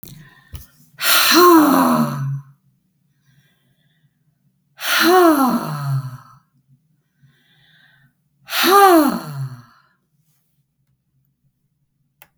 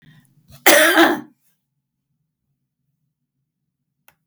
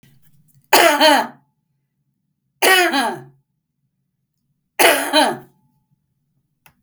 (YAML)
exhalation_length: 12.4 s
exhalation_amplitude: 32768
exhalation_signal_mean_std_ratio: 0.42
cough_length: 4.3 s
cough_amplitude: 32768
cough_signal_mean_std_ratio: 0.28
three_cough_length: 6.8 s
three_cough_amplitude: 32768
three_cough_signal_mean_std_ratio: 0.38
survey_phase: beta (2021-08-13 to 2022-03-07)
age: 65+
gender: Female
wearing_mask: 'No'
symptom_none: true
smoker_status: Ex-smoker
respiratory_condition_asthma: false
respiratory_condition_other: false
recruitment_source: REACT
submission_delay: 5 days
covid_test_result: Negative
covid_test_method: RT-qPCR
influenza_a_test_result: Negative
influenza_b_test_result: Negative